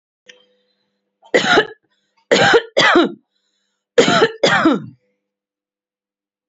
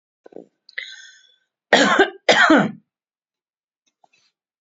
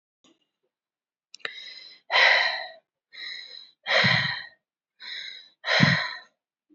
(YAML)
three_cough_length: 6.5 s
three_cough_amplitude: 30440
three_cough_signal_mean_std_ratio: 0.41
cough_length: 4.6 s
cough_amplitude: 30525
cough_signal_mean_std_ratio: 0.33
exhalation_length: 6.7 s
exhalation_amplitude: 18937
exhalation_signal_mean_std_ratio: 0.41
survey_phase: alpha (2021-03-01 to 2021-08-12)
age: 45-64
gender: Female
wearing_mask: 'No'
symptom_none: true
smoker_status: Ex-smoker
respiratory_condition_asthma: false
respiratory_condition_other: false
recruitment_source: Test and Trace
submission_delay: -1 day
covid_test_result: Negative
covid_test_method: LFT